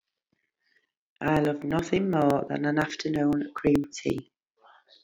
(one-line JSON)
{"exhalation_length": "5.0 s", "exhalation_amplitude": 11083, "exhalation_signal_mean_std_ratio": 0.61, "survey_phase": "beta (2021-08-13 to 2022-03-07)", "age": "45-64", "gender": "Female", "wearing_mask": "No", "symptom_none": true, "smoker_status": "Current smoker (11 or more cigarettes per day)", "respiratory_condition_asthma": false, "respiratory_condition_other": false, "recruitment_source": "REACT", "submission_delay": "10 days", "covid_test_result": "Negative", "covid_test_method": "RT-qPCR"}